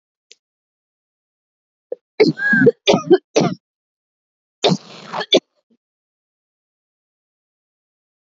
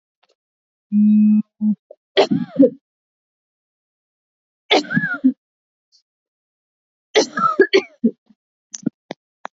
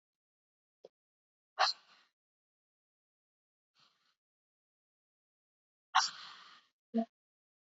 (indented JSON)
{
  "cough_length": "8.4 s",
  "cough_amplitude": 32768,
  "cough_signal_mean_std_ratio": 0.28,
  "three_cough_length": "9.6 s",
  "three_cough_amplitude": 30193,
  "three_cough_signal_mean_std_ratio": 0.37,
  "exhalation_length": "7.8 s",
  "exhalation_amplitude": 5743,
  "exhalation_signal_mean_std_ratio": 0.18,
  "survey_phase": "alpha (2021-03-01 to 2021-08-12)",
  "age": "18-44",
  "gender": "Female",
  "wearing_mask": "No",
  "symptom_cough_any": true,
  "symptom_new_continuous_cough": true,
  "symptom_shortness_of_breath": true,
  "symptom_diarrhoea": true,
  "symptom_fatigue": true,
  "symptom_change_to_sense_of_smell_or_taste": true,
  "symptom_loss_of_taste": true,
  "symptom_onset": "2 days",
  "smoker_status": "Never smoked",
  "respiratory_condition_asthma": false,
  "respiratory_condition_other": false,
  "recruitment_source": "Test and Trace",
  "submission_delay": "2 days",
  "covid_test_result": "Positive",
  "covid_test_method": "RT-qPCR",
  "covid_ct_value": 14.5,
  "covid_ct_gene": "N gene",
  "covid_ct_mean": 14.7,
  "covid_viral_load": "15000000 copies/ml",
  "covid_viral_load_category": "High viral load (>1M copies/ml)"
}